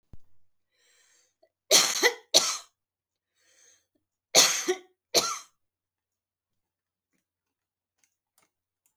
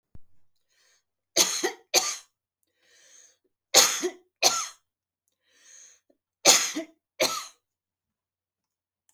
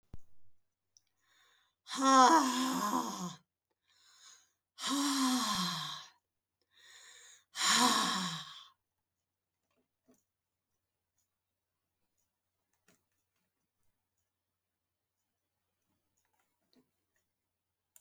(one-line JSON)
{"cough_length": "9.0 s", "cough_amplitude": 28215, "cough_signal_mean_std_ratio": 0.26, "three_cough_length": "9.1 s", "three_cough_amplitude": 28489, "three_cough_signal_mean_std_ratio": 0.3, "exhalation_length": "18.0 s", "exhalation_amplitude": 9558, "exhalation_signal_mean_std_ratio": 0.32, "survey_phase": "beta (2021-08-13 to 2022-03-07)", "age": "65+", "gender": "Female", "wearing_mask": "No", "symptom_none": true, "smoker_status": "Never smoked", "respiratory_condition_asthma": true, "respiratory_condition_other": false, "recruitment_source": "REACT", "submission_delay": "2 days", "covid_test_result": "Negative", "covid_test_method": "RT-qPCR"}